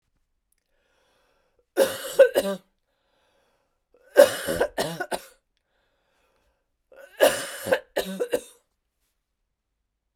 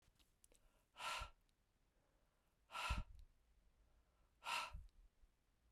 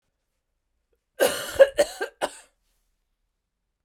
{"three_cough_length": "10.2 s", "three_cough_amplitude": 29589, "three_cough_signal_mean_std_ratio": 0.28, "exhalation_length": "5.7 s", "exhalation_amplitude": 958, "exhalation_signal_mean_std_ratio": 0.38, "cough_length": "3.8 s", "cough_amplitude": 21924, "cough_signal_mean_std_ratio": 0.25, "survey_phase": "beta (2021-08-13 to 2022-03-07)", "age": "45-64", "gender": "Female", "wearing_mask": "No", "symptom_cough_any": true, "symptom_runny_or_blocked_nose": true, "symptom_change_to_sense_of_smell_or_taste": true, "symptom_other": true, "symptom_onset": "5 days", "smoker_status": "Never smoked", "respiratory_condition_asthma": false, "respiratory_condition_other": false, "recruitment_source": "Test and Trace", "submission_delay": "2 days", "covid_test_result": "Positive", "covid_test_method": "RT-qPCR", "covid_ct_value": 18.1, "covid_ct_gene": "ORF1ab gene"}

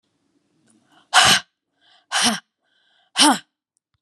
{"exhalation_length": "4.0 s", "exhalation_amplitude": 30672, "exhalation_signal_mean_std_ratio": 0.32, "survey_phase": "beta (2021-08-13 to 2022-03-07)", "age": "45-64", "gender": "Female", "wearing_mask": "No", "symptom_runny_or_blocked_nose": true, "symptom_fatigue": true, "symptom_onset": "12 days", "smoker_status": "Never smoked", "respiratory_condition_asthma": false, "respiratory_condition_other": false, "recruitment_source": "REACT", "submission_delay": "1 day", "covid_test_result": "Negative", "covid_test_method": "RT-qPCR", "influenza_a_test_result": "Negative", "influenza_b_test_result": "Negative"}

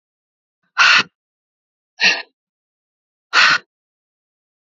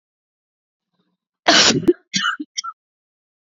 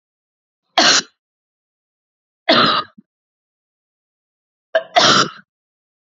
{"exhalation_length": "4.6 s", "exhalation_amplitude": 31825, "exhalation_signal_mean_std_ratio": 0.31, "cough_length": "3.6 s", "cough_amplitude": 30553, "cough_signal_mean_std_ratio": 0.33, "three_cough_length": "6.1 s", "three_cough_amplitude": 32768, "three_cough_signal_mean_std_ratio": 0.32, "survey_phase": "beta (2021-08-13 to 2022-03-07)", "age": "18-44", "gender": "Female", "wearing_mask": "No", "symptom_cough_any": true, "symptom_new_continuous_cough": true, "symptom_runny_or_blocked_nose": true, "symptom_fatigue": true, "symptom_onset": "8 days", "smoker_status": "Never smoked", "respiratory_condition_asthma": true, "respiratory_condition_other": false, "recruitment_source": "Test and Trace", "submission_delay": "0 days", "covid_test_result": "Negative", "covid_test_method": "RT-qPCR"}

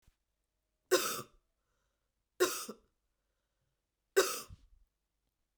{"three_cough_length": "5.6 s", "three_cough_amplitude": 6494, "three_cough_signal_mean_std_ratio": 0.26, "survey_phase": "beta (2021-08-13 to 2022-03-07)", "age": "45-64", "gender": "Female", "wearing_mask": "No", "symptom_cough_any": true, "symptom_runny_or_blocked_nose": true, "symptom_fatigue": true, "symptom_other": true, "smoker_status": "Never smoked", "respiratory_condition_asthma": false, "respiratory_condition_other": false, "recruitment_source": "Test and Trace", "submission_delay": "2 days", "covid_test_result": "Positive", "covid_test_method": "RT-qPCR"}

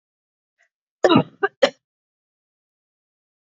{"cough_length": "3.6 s", "cough_amplitude": 31973, "cough_signal_mean_std_ratio": 0.21, "survey_phase": "beta (2021-08-13 to 2022-03-07)", "age": "45-64", "gender": "Female", "wearing_mask": "No", "symptom_cough_any": true, "symptom_runny_or_blocked_nose": true, "symptom_fatigue": true, "smoker_status": "Never smoked", "respiratory_condition_asthma": false, "respiratory_condition_other": false, "recruitment_source": "Test and Trace", "submission_delay": "3 days", "covid_test_result": "Positive", "covid_test_method": "LFT"}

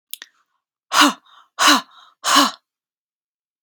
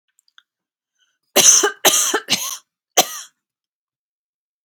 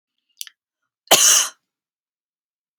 {"exhalation_length": "3.6 s", "exhalation_amplitude": 32767, "exhalation_signal_mean_std_ratio": 0.34, "three_cough_length": "4.6 s", "three_cough_amplitude": 32768, "three_cough_signal_mean_std_ratio": 0.34, "cough_length": "2.8 s", "cough_amplitude": 32768, "cough_signal_mean_std_ratio": 0.28, "survey_phase": "beta (2021-08-13 to 2022-03-07)", "age": "18-44", "gender": "Female", "wearing_mask": "No", "symptom_shortness_of_breath": true, "symptom_fatigue": true, "symptom_onset": "12 days", "smoker_status": "Never smoked", "respiratory_condition_asthma": false, "respiratory_condition_other": false, "recruitment_source": "REACT", "submission_delay": "2 days", "covid_test_result": "Negative", "covid_test_method": "RT-qPCR", "influenza_a_test_result": "Negative", "influenza_b_test_result": "Negative"}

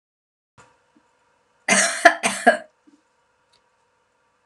{"cough_length": "4.5 s", "cough_amplitude": 32768, "cough_signal_mean_std_ratio": 0.26, "survey_phase": "beta (2021-08-13 to 2022-03-07)", "age": "45-64", "gender": "Female", "wearing_mask": "No", "symptom_none": true, "smoker_status": "Never smoked", "respiratory_condition_asthma": false, "respiratory_condition_other": false, "recruitment_source": "REACT", "submission_delay": "1 day", "covid_test_result": "Negative", "covid_test_method": "RT-qPCR"}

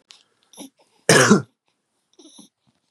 {"cough_length": "2.9 s", "cough_amplitude": 32767, "cough_signal_mean_std_ratio": 0.27, "survey_phase": "beta (2021-08-13 to 2022-03-07)", "age": "18-44", "gender": "Male", "wearing_mask": "No", "symptom_none": true, "smoker_status": "Never smoked", "respiratory_condition_asthma": false, "respiratory_condition_other": false, "recruitment_source": "REACT", "submission_delay": "1 day", "covid_test_result": "Negative", "covid_test_method": "RT-qPCR", "influenza_a_test_result": "Negative", "influenza_b_test_result": "Negative"}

